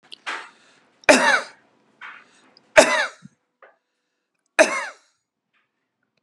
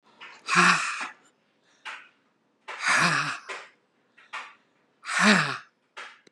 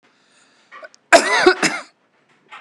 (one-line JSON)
{"three_cough_length": "6.2 s", "three_cough_amplitude": 32768, "three_cough_signal_mean_std_ratio": 0.28, "exhalation_length": "6.3 s", "exhalation_amplitude": 17710, "exhalation_signal_mean_std_ratio": 0.42, "cough_length": "2.6 s", "cough_amplitude": 32768, "cough_signal_mean_std_ratio": 0.35, "survey_phase": "beta (2021-08-13 to 2022-03-07)", "age": "45-64", "gender": "Female", "wearing_mask": "No", "symptom_none": true, "smoker_status": "Never smoked", "respiratory_condition_asthma": false, "respiratory_condition_other": false, "recruitment_source": "REACT", "submission_delay": "1 day", "covid_test_result": "Negative", "covid_test_method": "RT-qPCR", "influenza_a_test_result": "Negative", "influenza_b_test_result": "Negative"}